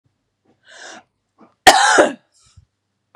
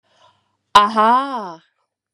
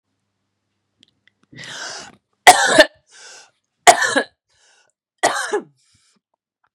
{"cough_length": "3.2 s", "cough_amplitude": 32768, "cough_signal_mean_std_ratio": 0.29, "exhalation_length": "2.1 s", "exhalation_amplitude": 32768, "exhalation_signal_mean_std_ratio": 0.42, "three_cough_length": "6.7 s", "three_cough_amplitude": 32768, "three_cough_signal_mean_std_ratio": 0.27, "survey_phase": "beta (2021-08-13 to 2022-03-07)", "age": "45-64", "gender": "Female", "wearing_mask": "No", "symptom_runny_or_blocked_nose": true, "symptom_sore_throat": true, "symptom_fatigue": true, "symptom_headache": true, "smoker_status": "Ex-smoker", "respiratory_condition_asthma": false, "respiratory_condition_other": false, "recruitment_source": "Test and Trace", "submission_delay": "2 days", "covid_test_result": "Positive", "covid_test_method": "RT-qPCR", "covid_ct_value": 25.1, "covid_ct_gene": "N gene"}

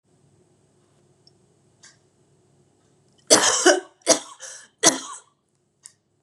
{"three_cough_length": "6.2 s", "three_cough_amplitude": 32768, "three_cough_signal_mean_std_ratio": 0.27, "survey_phase": "beta (2021-08-13 to 2022-03-07)", "age": "18-44", "gender": "Female", "wearing_mask": "No", "symptom_cough_any": true, "symptom_runny_or_blocked_nose": true, "symptom_sore_throat": true, "symptom_fatigue": true, "symptom_headache": true, "smoker_status": "Never smoked", "respiratory_condition_asthma": false, "respiratory_condition_other": false, "recruitment_source": "Test and Trace", "submission_delay": "2 days", "covid_test_result": "Positive", "covid_test_method": "RT-qPCR", "covid_ct_value": 30.6, "covid_ct_gene": "N gene"}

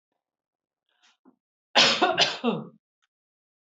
{"cough_length": "3.8 s", "cough_amplitude": 18153, "cough_signal_mean_std_ratio": 0.33, "survey_phase": "beta (2021-08-13 to 2022-03-07)", "age": "45-64", "gender": "Female", "wearing_mask": "No", "symptom_none": true, "symptom_onset": "12 days", "smoker_status": "Never smoked", "respiratory_condition_asthma": false, "respiratory_condition_other": false, "recruitment_source": "REACT", "submission_delay": "1 day", "covid_test_result": "Negative", "covid_test_method": "RT-qPCR"}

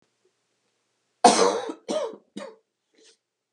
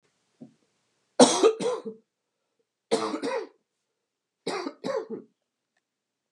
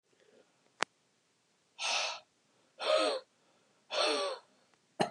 {"cough_length": "3.5 s", "cough_amplitude": 30578, "cough_signal_mean_std_ratio": 0.3, "three_cough_length": "6.3 s", "three_cough_amplitude": 24455, "three_cough_signal_mean_std_ratio": 0.32, "exhalation_length": "5.1 s", "exhalation_amplitude": 12244, "exhalation_signal_mean_std_ratio": 0.41, "survey_phase": "beta (2021-08-13 to 2022-03-07)", "age": "45-64", "gender": "Female", "wearing_mask": "No", "symptom_cough_any": true, "symptom_new_continuous_cough": true, "symptom_runny_or_blocked_nose": true, "symptom_fever_high_temperature": true, "symptom_headache": true, "smoker_status": "Never smoked", "respiratory_condition_asthma": false, "respiratory_condition_other": false, "recruitment_source": "Test and Trace", "submission_delay": "0 days", "covid_test_result": "Positive", "covid_test_method": "LFT"}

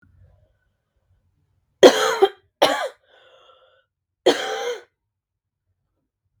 {"three_cough_length": "6.4 s", "three_cough_amplitude": 32768, "three_cough_signal_mean_std_ratio": 0.26, "survey_phase": "beta (2021-08-13 to 2022-03-07)", "age": "18-44", "gender": "Female", "wearing_mask": "No", "symptom_cough_any": true, "symptom_runny_or_blocked_nose": true, "symptom_sore_throat": true, "symptom_diarrhoea": true, "symptom_other": true, "smoker_status": "Never smoked", "respiratory_condition_asthma": false, "respiratory_condition_other": false, "recruitment_source": "Test and Trace", "submission_delay": "1 day", "covid_test_result": "Positive", "covid_test_method": "RT-qPCR", "covid_ct_value": 30.0, "covid_ct_gene": "N gene"}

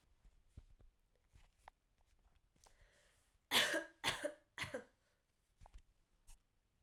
{"three_cough_length": "6.8 s", "three_cough_amplitude": 3077, "three_cough_signal_mean_std_ratio": 0.28, "survey_phase": "beta (2021-08-13 to 2022-03-07)", "age": "18-44", "gender": "Female", "wearing_mask": "No", "symptom_cough_any": true, "symptom_runny_or_blocked_nose": true, "symptom_sore_throat": true, "symptom_fatigue": true, "symptom_headache": true, "symptom_other": true, "symptom_onset": "3 days", "smoker_status": "Never smoked", "respiratory_condition_asthma": false, "respiratory_condition_other": false, "recruitment_source": "Test and Trace", "submission_delay": "1 day", "covid_test_result": "Positive", "covid_test_method": "RT-qPCR", "covid_ct_value": 23.2, "covid_ct_gene": "ORF1ab gene", "covid_ct_mean": 23.5, "covid_viral_load": "19000 copies/ml", "covid_viral_load_category": "Low viral load (10K-1M copies/ml)"}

